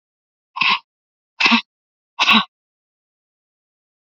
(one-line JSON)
{"exhalation_length": "4.0 s", "exhalation_amplitude": 31763, "exhalation_signal_mean_std_ratio": 0.31, "survey_phase": "beta (2021-08-13 to 2022-03-07)", "age": "45-64", "gender": "Female", "wearing_mask": "No", "symptom_cough_any": true, "symptom_runny_or_blocked_nose": true, "symptom_sore_throat": true, "symptom_diarrhoea": true, "symptom_fatigue": true, "symptom_headache": true, "smoker_status": "Ex-smoker", "respiratory_condition_asthma": false, "respiratory_condition_other": false, "recruitment_source": "Test and Trace", "submission_delay": "2 days", "covid_test_result": "Positive", "covid_test_method": "ePCR"}